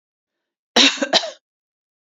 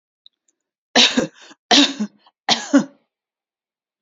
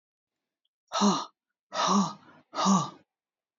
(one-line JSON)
{"cough_length": "2.1 s", "cough_amplitude": 30578, "cough_signal_mean_std_ratio": 0.32, "three_cough_length": "4.0 s", "three_cough_amplitude": 32168, "three_cough_signal_mean_std_ratio": 0.34, "exhalation_length": "3.6 s", "exhalation_amplitude": 8311, "exhalation_signal_mean_std_ratio": 0.44, "survey_phase": "beta (2021-08-13 to 2022-03-07)", "age": "45-64", "gender": "Female", "wearing_mask": "No", "symptom_none": true, "symptom_onset": "9 days", "smoker_status": "Never smoked", "respiratory_condition_asthma": false, "respiratory_condition_other": false, "recruitment_source": "REACT", "submission_delay": "3 days", "covid_test_result": "Negative", "covid_test_method": "RT-qPCR"}